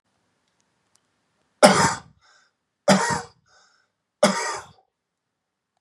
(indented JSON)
{
  "three_cough_length": "5.8 s",
  "three_cough_amplitude": 32768,
  "three_cough_signal_mean_std_ratio": 0.29,
  "survey_phase": "beta (2021-08-13 to 2022-03-07)",
  "age": "18-44",
  "gender": "Male",
  "wearing_mask": "No",
  "symptom_none": true,
  "symptom_onset": "12 days",
  "smoker_status": "Never smoked",
  "respiratory_condition_asthma": false,
  "respiratory_condition_other": true,
  "recruitment_source": "REACT",
  "submission_delay": "1 day",
  "covid_test_result": "Negative",
  "covid_test_method": "RT-qPCR"
}